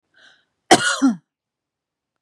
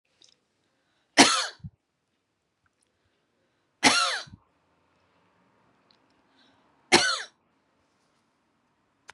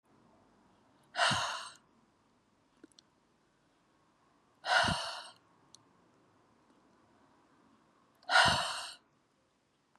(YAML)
cough_length: 2.2 s
cough_amplitude: 32749
cough_signal_mean_std_ratio: 0.3
three_cough_length: 9.1 s
three_cough_amplitude: 32672
three_cough_signal_mean_std_ratio: 0.23
exhalation_length: 10.0 s
exhalation_amplitude: 8666
exhalation_signal_mean_std_ratio: 0.3
survey_phase: beta (2021-08-13 to 2022-03-07)
age: 45-64
gender: Female
wearing_mask: 'No'
symptom_none: true
smoker_status: Never smoked
respiratory_condition_asthma: false
respiratory_condition_other: false
recruitment_source: REACT
submission_delay: 2 days
covid_test_result: Negative
covid_test_method: RT-qPCR
influenza_a_test_result: Negative
influenza_b_test_result: Negative